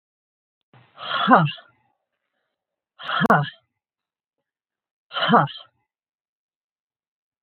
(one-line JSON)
{"exhalation_length": "7.4 s", "exhalation_amplitude": 27007, "exhalation_signal_mean_std_ratio": 0.29, "survey_phase": "beta (2021-08-13 to 2022-03-07)", "age": "45-64", "gender": "Female", "wearing_mask": "No", "symptom_cough_any": true, "symptom_runny_or_blocked_nose": true, "symptom_sore_throat": true, "symptom_headache": true, "symptom_onset": "5 days", "smoker_status": "Never smoked", "respiratory_condition_asthma": false, "respiratory_condition_other": false, "recruitment_source": "Test and Trace", "submission_delay": "1 day", "covid_test_result": "Positive", "covid_test_method": "RT-qPCR"}